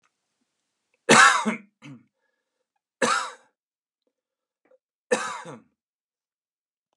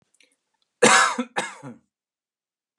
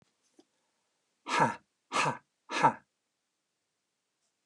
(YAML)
three_cough_length: 7.0 s
three_cough_amplitude: 26731
three_cough_signal_mean_std_ratio: 0.25
cough_length: 2.8 s
cough_amplitude: 25737
cough_signal_mean_std_ratio: 0.31
exhalation_length: 4.5 s
exhalation_amplitude: 10656
exhalation_signal_mean_std_ratio: 0.29
survey_phase: beta (2021-08-13 to 2022-03-07)
age: 45-64
gender: Male
wearing_mask: 'No'
symptom_runny_or_blocked_nose: true
symptom_onset: 6 days
smoker_status: Never smoked
respiratory_condition_asthma: false
respiratory_condition_other: false
recruitment_source: REACT
submission_delay: 1 day
covid_test_result: Negative
covid_test_method: RT-qPCR
influenza_a_test_result: Negative
influenza_b_test_result: Negative